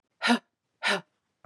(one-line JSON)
{"exhalation_length": "1.5 s", "exhalation_amplitude": 10394, "exhalation_signal_mean_std_ratio": 0.37, "survey_phase": "beta (2021-08-13 to 2022-03-07)", "age": "45-64", "gender": "Female", "wearing_mask": "No", "symptom_runny_or_blocked_nose": true, "symptom_fatigue": true, "smoker_status": "Never smoked", "respiratory_condition_asthma": false, "respiratory_condition_other": false, "recruitment_source": "Test and Trace", "submission_delay": "1 day", "covid_test_result": "Positive", "covid_test_method": "RT-qPCR", "covid_ct_value": 28.4, "covid_ct_gene": "N gene"}